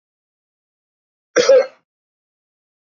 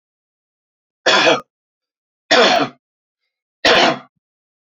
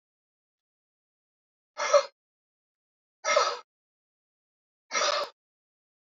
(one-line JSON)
{"cough_length": "3.0 s", "cough_amplitude": 27417, "cough_signal_mean_std_ratio": 0.24, "three_cough_length": "4.7 s", "three_cough_amplitude": 32768, "three_cough_signal_mean_std_ratio": 0.38, "exhalation_length": "6.1 s", "exhalation_amplitude": 12943, "exhalation_signal_mean_std_ratio": 0.28, "survey_phase": "beta (2021-08-13 to 2022-03-07)", "age": "45-64", "gender": "Male", "wearing_mask": "No", "symptom_none": true, "smoker_status": "Never smoked", "respiratory_condition_asthma": false, "respiratory_condition_other": false, "recruitment_source": "REACT", "submission_delay": "2 days", "covid_test_result": "Negative", "covid_test_method": "RT-qPCR", "influenza_a_test_result": "Negative", "influenza_b_test_result": "Negative"}